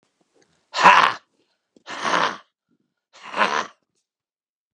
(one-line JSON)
{"exhalation_length": "4.7 s", "exhalation_amplitude": 32767, "exhalation_signal_mean_std_ratio": 0.31, "survey_phase": "beta (2021-08-13 to 2022-03-07)", "age": "65+", "gender": "Male", "wearing_mask": "No", "symptom_shortness_of_breath": true, "smoker_status": "Ex-smoker", "respiratory_condition_asthma": false, "respiratory_condition_other": true, "recruitment_source": "REACT", "submission_delay": "1 day", "covid_test_result": "Negative", "covid_test_method": "RT-qPCR", "influenza_a_test_result": "Negative", "influenza_b_test_result": "Negative"}